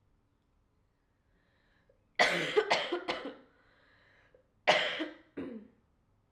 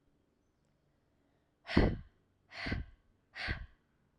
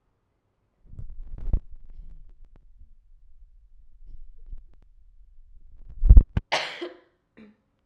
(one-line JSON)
{"cough_length": "6.3 s", "cough_amplitude": 9191, "cough_signal_mean_std_ratio": 0.36, "exhalation_length": "4.2 s", "exhalation_amplitude": 7970, "exhalation_signal_mean_std_ratio": 0.3, "three_cough_length": "7.9 s", "three_cough_amplitude": 32768, "three_cough_signal_mean_std_ratio": 0.23, "survey_phase": "alpha (2021-03-01 to 2021-08-12)", "age": "18-44", "gender": "Female", "wearing_mask": "No", "symptom_cough_any": true, "symptom_new_continuous_cough": true, "symptom_fatigue": true, "symptom_onset": "7 days", "smoker_status": "Prefer not to say", "respiratory_condition_asthma": false, "respiratory_condition_other": false, "recruitment_source": "Test and Trace", "submission_delay": "1 day", "covid_test_result": "Positive", "covid_test_method": "RT-qPCR", "covid_ct_value": 21.5, "covid_ct_gene": "N gene", "covid_ct_mean": 21.6, "covid_viral_load": "82000 copies/ml", "covid_viral_load_category": "Low viral load (10K-1M copies/ml)"}